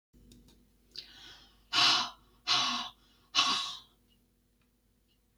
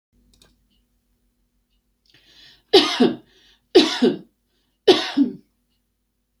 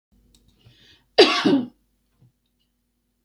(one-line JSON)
{"exhalation_length": "5.4 s", "exhalation_amplitude": 9216, "exhalation_signal_mean_std_ratio": 0.38, "three_cough_length": "6.4 s", "three_cough_amplitude": 28797, "three_cough_signal_mean_std_ratio": 0.3, "cough_length": "3.2 s", "cough_amplitude": 29153, "cough_signal_mean_std_ratio": 0.27, "survey_phase": "beta (2021-08-13 to 2022-03-07)", "age": "65+", "gender": "Female", "wearing_mask": "No", "symptom_none": true, "smoker_status": "Ex-smoker", "respiratory_condition_asthma": false, "respiratory_condition_other": false, "recruitment_source": "Test and Trace", "submission_delay": "1 day", "covid_test_result": "Negative", "covid_test_method": "LFT"}